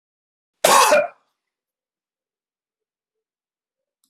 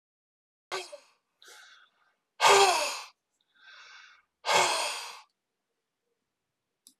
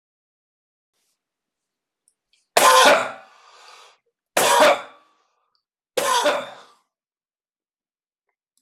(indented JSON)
{
  "cough_length": "4.1 s",
  "cough_amplitude": 26027,
  "cough_signal_mean_std_ratio": 0.26,
  "exhalation_length": "7.0 s",
  "exhalation_amplitude": 14690,
  "exhalation_signal_mean_std_ratio": 0.32,
  "three_cough_length": "8.6 s",
  "three_cough_amplitude": 25945,
  "three_cough_signal_mean_std_ratio": 0.32,
  "survey_phase": "alpha (2021-03-01 to 2021-08-12)",
  "age": "45-64",
  "gender": "Male",
  "wearing_mask": "No",
  "symptom_none": true,
  "smoker_status": "Never smoked",
  "respiratory_condition_asthma": false,
  "respiratory_condition_other": false,
  "recruitment_source": "REACT",
  "submission_delay": "2 days",
  "covid_test_result": "Negative",
  "covid_test_method": "RT-qPCR"
}